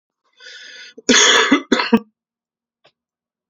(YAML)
cough_length: 3.5 s
cough_amplitude: 32767
cough_signal_mean_std_ratio: 0.38
survey_phase: beta (2021-08-13 to 2022-03-07)
age: 18-44
gender: Male
wearing_mask: 'No'
symptom_cough_any: true
symptom_shortness_of_breath: true
symptom_fever_high_temperature: true
symptom_change_to_sense_of_smell_or_taste: true
smoker_status: Ex-smoker
respiratory_condition_asthma: true
respiratory_condition_other: false
recruitment_source: Test and Trace
submission_delay: 2 days
covid_test_result: Positive
covid_test_method: LFT